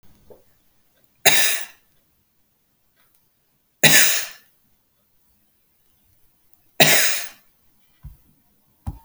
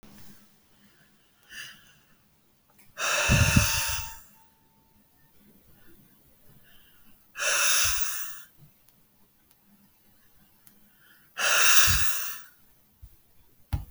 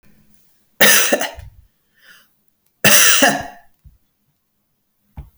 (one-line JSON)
{"three_cough_length": "9.0 s", "three_cough_amplitude": 32768, "three_cough_signal_mean_std_ratio": 0.29, "exhalation_length": "13.9 s", "exhalation_amplitude": 21099, "exhalation_signal_mean_std_ratio": 0.39, "cough_length": "5.4 s", "cough_amplitude": 32768, "cough_signal_mean_std_ratio": 0.35, "survey_phase": "beta (2021-08-13 to 2022-03-07)", "age": "45-64", "gender": "Female", "wearing_mask": "No", "symptom_none": true, "smoker_status": "Never smoked", "respiratory_condition_asthma": false, "respiratory_condition_other": false, "recruitment_source": "REACT", "submission_delay": "2 days", "covid_test_result": "Negative", "covid_test_method": "RT-qPCR"}